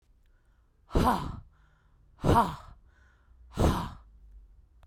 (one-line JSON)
{"exhalation_length": "4.9 s", "exhalation_amplitude": 11821, "exhalation_signal_mean_std_ratio": 0.38, "survey_phase": "beta (2021-08-13 to 2022-03-07)", "age": "18-44", "gender": "Female", "wearing_mask": "Yes", "symptom_sore_throat": true, "smoker_status": "Ex-smoker", "respiratory_condition_asthma": false, "respiratory_condition_other": false, "recruitment_source": "REACT", "submission_delay": "-15 days", "covid_test_result": "Negative", "covid_test_method": "RT-qPCR", "influenza_a_test_result": "Unknown/Void", "influenza_b_test_result": "Unknown/Void"}